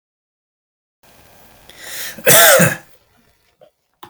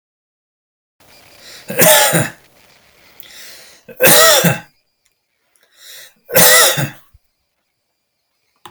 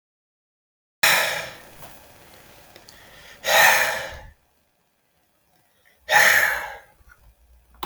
{"cough_length": "4.1 s", "cough_amplitude": 32768, "cough_signal_mean_std_ratio": 0.32, "three_cough_length": "8.7 s", "three_cough_amplitude": 32768, "three_cough_signal_mean_std_ratio": 0.37, "exhalation_length": "7.9 s", "exhalation_amplitude": 25640, "exhalation_signal_mean_std_ratio": 0.37, "survey_phase": "beta (2021-08-13 to 2022-03-07)", "age": "45-64", "gender": "Male", "wearing_mask": "No", "symptom_none": true, "smoker_status": "Never smoked", "respiratory_condition_asthma": false, "respiratory_condition_other": false, "recruitment_source": "REACT", "submission_delay": "2 days", "covid_test_result": "Negative", "covid_test_method": "RT-qPCR"}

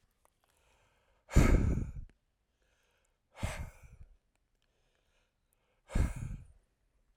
{"exhalation_length": "7.2 s", "exhalation_amplitude": 9891, "exhalation_signal_mean_std_ratio": 0.29, "survey_phase": "alpha (2021-03-01 to 2021-08-12)", "age": "45-64", "gender": "Male", "wearing_mask": "No", "symptom_fatigue": true, "symptom_headache": true, "symptom_onset": "6 days", "smoker_status": "Ex-smoker", "respiratory_condition_asthma": false, "respiratory_condition_other": false, "recruitment_source": "REACT", "submission_delay": "2 days", "covid_test_result": "Negative", "covid_test_method": "RT-qPCR"}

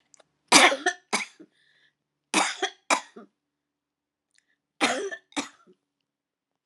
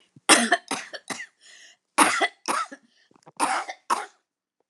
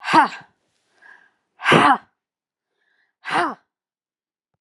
{"three_cough_length": "6.7 s", "three_cough_amplitude": 28967, "three_cough_signal_mean_std_ratio": 0.29, "cough_length": "4.7 s", "cough_amplitude": 30969, "cough_signal_mean_std_ratio": 0.39, "exhalation_length": "4.6 s", "exhalation_amplitude": 29702, "exhalation_signal_mean_std_ratio": 0.31, "survey_phase": "alpha (2021-03-01 to 2021-08-12)", "age": "65+", "gender": "Female", "wearing_mask": "No", "symptom_none": true, "smoker_status": "Ex-smoker", "respiratory_condition_asthma": false, "respiratory_condition_other": false, "recruitment_source": "REACT", "submission_delay": "3 days", "covid_test_result": "Negative", "covid_test_method": "RT-qPCR"}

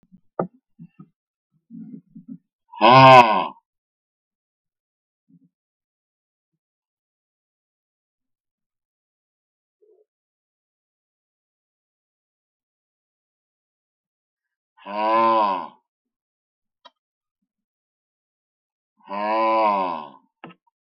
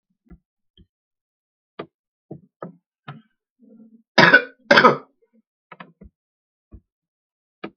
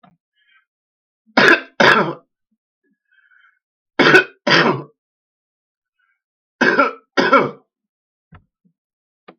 {"exhalation_length": "20.8 s", "exhalation_amplitude": 32768, "exhalation_signal_mean_std_ratio": 0.23, "cough_length": "7.8 s", "cough_amplitude": 32768, "cough_signal_mean_std_ratio": 0.2, "three_cough_length": "9.4 s", "three_cough_amplitude": 32768, "three_cough_signal_mean_std_ratio": 0.33, "survey_phase": "beta (2021-08-13 to 2022-03-07)", "age": "65+", "gender": "Male", "wearing_mask": "No", "symptom_new_continuous_cough": true, "symptom_sore_throat": true, "smoker_status": "Ex-smoker", "respiratory_condition_asthma": false, "respiratory_condition_other": false, "recruitment_source": "Test and Trace", "submission_delay": "1 day", "covid_test_result": "Negative", "covid_test_method": "LFT"}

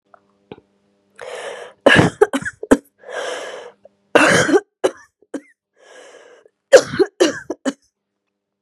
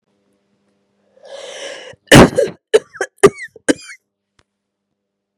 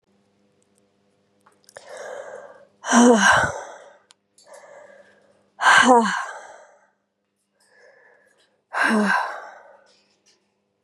{"three_cough_length": "8.6 s", "three_cough_amplitude": 32768, "three_cough_signal_mean_std_ratio": 0.34, "cough_length": "5.4 s", "cough_amplitude": 32768, "cough_signal_mean_std_ratio": 0.26, "exhalation_length": "10.8 s", "exhalation_amplitude": 29931, "exhalation_signal_mean_std_ratio": 0.35, "survey_phase": "beta (2021-08-13 to 2022-03-07)", "age": "18-44", "gender": "Female", "wearing_mask": "No", "symptom_cough_any": true, "symptom_runny_or_blocked_nose": true, "symptom_shortness_of_breath": true, "symptom_sore_throat": true, "symptom_abdominal_pain": true, "symptom_diarrhoea": true, "symptom_fatigue": true, "symptom_fever_high_temperature": true, "symptom_headache": true, "smoker_status": "Never smoked", "respiratory_condition_asthma": false, "respiratory_condition_other": false, "recruitment_source": "Test and Trace", "submission_delay": "1 day", "covid_test_result": "Positive", "covid_test_method": "LFT"}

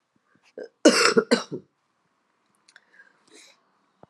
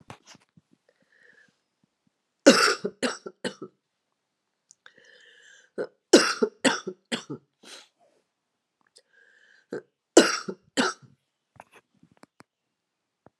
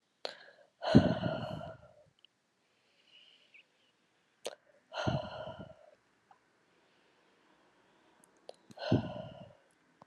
{"cough_length": "4.1 s", "cough_amplitude": 24257, "cough_signal_mean_std_ratio": 0.26, "three_cough_length": "13.4 s", "three_cough_amplitude": 31303, "three_cough_signal_mean_std_ratio": 0.23, "exhalation_length": "10.1 s", "exhalation_amplitude": 12356, "exhalation_signal_mean_std_ratio": 0.27, "survey_phase": "alpha (2021-03-01 to 2021-08-12)", "age": "45-64", "gender": "Female", "wearing_mask": "No", "symptom_cough_any": true, "symptom_fatigue": true, "symptom_fever_high_temperature": true, "symptom_change_to_sense_of_smell_or_taste": true, "symptom_onset": "4 days", "smoker_status": "Never smoked", "respiratory_condition_asthma": false, "respiratory_condition_other": false, "recruitment_source": "Test and Trace", "submission_delay": "1 day", "covid_test_result": "Positive", "covid_test_method": "RT-qPCR", "covid_ct_value": 13.6, "covid_ct_gene": "S gene", "covid_ct_mean": 14.1, "covid_viral_load": "23000000 copies/ml", "covid_viral_load_category": "High viral load (>1M copies/ml)"}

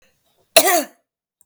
{"cough_length": "1.5 s", "cough_amplitude": 32768, "cough_signal_mean_std_ratio": 0.32, "survey_phase": "beta (2021-08-13 to 2022-03-07)", "age": "45-64", "gender": "Female", "wearing_mask": "No", "symptom_none": true, "smoker_status": "Ex-smoker", "respiratory_condition_asthma": false, "respiratory_condition_other": false, "recruitment_source": "REACT", "submission_delay": "1 day", "covid_test_result": "Negative", "covid_test_method": "RT-qPCR", "influenza_a_test_result": "Negative", "influenza_b_test_result": "Negative"}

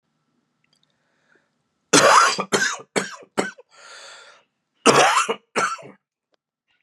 {"cough_length": "6.8 s", "cough_amplitude": 32767, "cough_signal_mean_std_ratio": 0.37, "survey_phase": "beta (2021-08-13 to 2022-03-07)", "age": "45-64", "gender": "Female", "wearing_mask": "No", "symptom_cough_any": true, "symptom_runny_or_blocked_nose": true, "symptom_sore_throat": true, "symptom_fatigue": true, "symptom_headache": true, "symptom_change_to_sense_of_smell_or_taste": true, "smoker_status": "Ex-smoker", "respiratory_condition_asthma": false, "respiratory_condition_other": false, "recruitment_source": "Test and Trace", "submission_delay": "2 days", "covid_test_result": "Negative", "covid_test_method": "RT-qPCR"}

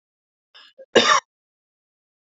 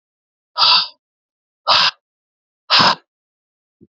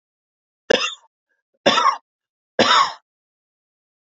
{"cough_length": "2.3 s", "cough_amplitude": 27726, "cough_signal_mean_std_ratio": 0.25, "exhalation_length": "3.9 s", "exhalation_amplitude": 32767, "exhalation_signal_mean_std_ratio": 0.36, "three_cough_length": "4.1 s", "three_cough_amplitude": 28581, "three_cough_signal_mean_std_ratio": 0.34, "survey_phase": "alpha (2021-03-01 to 2021-08-12)", "age": "18-44", "gender": "Male", "wearing_mask": "No", "symptom_cough_any": true, "symptom_fatigue": true, "symptom_fever_high_temperature": true, "symptom_headache": true, "symptom_change_to_sense_of_smell_or_taste": true, "smoker_status": "Never smoked", "respiratory_condition_asthma": false, "respiratory_condition_other": false, "recruitment_source": "Test and Trace", "submission_delay": "4 days", "covid_test_result": "Positive", "covid_test_method": "RT-qPCR"}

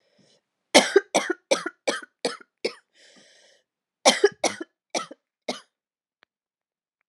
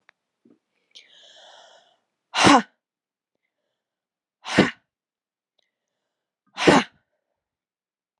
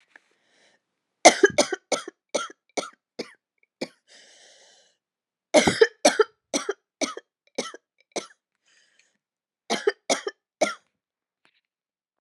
{"cough_length": "7.1 s", "cough_amplitude": 32343, "cough_signal_mean_std_ratio": 0.26, "exhalation_length": "8.2 s", "exhalation_amplitude": 29649, "exhalation_signal_mean_std_ratio": 0.21, "three_cough_length": "12.2 s", "three_cough_amplitude": 31707, "three_cough_signal_mean_std_ratio": 0.24, "survey_phase": "beta (2021-08-13 to 2022-03-07)", "age": "18-44", "gender": "Female", "wearing_mask": "No", "symptom_cough_any": true, "symptom_new_continuous_cough": true, "symptom_runny_or_blocked_nose": true, "symptom_shortness_of_breath": true, "symptom_sore_throat": true, "symptom_fatigue": true, "symptom_fever_high_temperature": true, "symptom_headache": true, "symptom_other": true, "symptom_onset": "9 days", "smoker_status": "Never smoked", "respiratory_condition_asthma": false, "respiratory_condition_other": false, "recruitment_source": "Test and Trace", "submission_delay": "1 day", "covid_test_result": "Positive", "covid_test_method": "RT-qPCR", "covid_ct_value": 26.0, "covid_ct_gene": "N gene"}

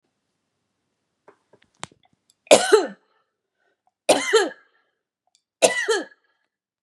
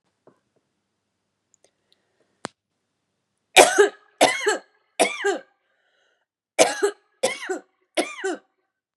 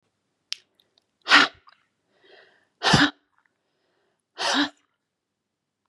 {"three_cough_length": "6.8 s", "three_cough_amplitude": 32767, "three_cough_signal_mean_std_ratio": 0.27, "cough_length": "9.0 s", "cough_amplitude": 32767, "cough_signal_mean_std_ratio": 0.29, "exhalation_length": "5.9 s", "exhalation_amplitude": 27930, "exhalation_signal_mean_std_ratio": 0.26, "survey_phase": "beta (2021-08-13 to 2022-03-07)", "age": "45-64", "gender": "Female", "wearing_mask": "No", "symptom_headache": true, "smoker_status": "Current smoker (1 to 10 cigarettes per day)", "respiratory_condition_asthma": false, "respiratory_condition_other": false, "recruitment_source": "REACT", "submission_delay": "0 days", "covid_test_result": "Negative", "covid_test_method": "RT-qPCR", "influenza_a_test_result": "Negative", "influenza_b_test_result": "Negative"}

